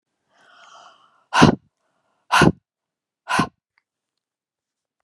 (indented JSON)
{
  "exhalation_length": "5.0 s",
  "exhalation_amplitude": 32768,
  "exhalation_signal_mean_std_ratio": 0.25,
  "survey_phase": "beta (2021-08-13 to 2022-03-07)",
  "age": "45-64",
  "gender": "Female",
  "wearing_mask": "No",
  "symptom_change_to_sense_of_smell_or_taste": true,
  "smoker_status": "Ex-smoker",
  "respiratory_condition_asthma": false,
  "respiratory_condition_other": false,
  "recruitment_source": "REACT",
  "submission_delay": "7 days",
  "covid_test_result": "Negative",
  "covid_test_method": "RT-qPCR"
}